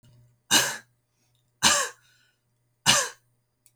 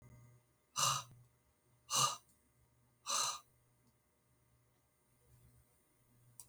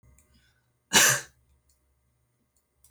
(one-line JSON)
{"three_cough_length": "3.8 s", "three_cough_amplitude": 25078, "three_cough_signal_mean_std_ratio": 0.33, "exhalation_length": "6.5 s", "exhalation_amplitude": 3533, "exhalation_signal_mean_std_ratio": 0.31, "cough_length": "2.9 s", "cough_amplitude": 23446, "cough_signal_mean_std_ratio": 0.24, "survey_phase": "beta (2021-08-13 to 2022-03-07)", "age": "45-64", "gender": "Female", "wearing_mask": "No", "symptom_fatigue": true, "symptom_change_to_sense_of_smell_or_taste": true, "symptom_loss_of_taste": true, "symptom_onset": "12 days", "smoker_status": "Never smoked", "respiratory_condition_asthma": false, "respiratory_condition_other": false, "recruitment_source": "REACT", "submission_delay": "1 day", "covid_test_result": "Negative", "covid_test_method": "RT-qPCR", "influenza_a_test_result": "Negative", "influenza_b_test_result": "Negative"}